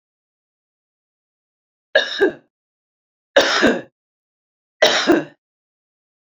three_cough_length: 6.3 s
three_cough_amplitude: 29676
three_cough_signal_mean_std_ratio: 0.32
survey_phase: beta (2021-08-13 to 2022-03-07)
age: 45-64
gender: Female
wearing_mask: 'No'
symptom_none: true
smoker_status: Current smoker (1 to 10 cigarettes per day)
respiratory_condition_asthma: false
respiratory_condition_other: false
recruitment_source: REACT
submission_delay: 2 days
covid_test_result: Negative
covid_test_method: RT-qPCR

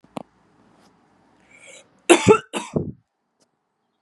cough_length: 4.0 s
cough_amplitude: 31985
cough_signal_mean_std_ratio: 0.23
survey_phase: beta (2021-08-13 to 2022-03-07)
age: 45-64
gender: Female
wearing_mask: 'No'
symptom_none: true
smoker_status: Never smoked
respiratory_condition_asthma: false
respiratory_condition_other: false
recruitment_source: REACT
submission_delay: 3 days
covid_test_result: Negative
covid_test_method: RT-qPCR
influenza_a_test_result: Negative
influenza_b_test_result: Negative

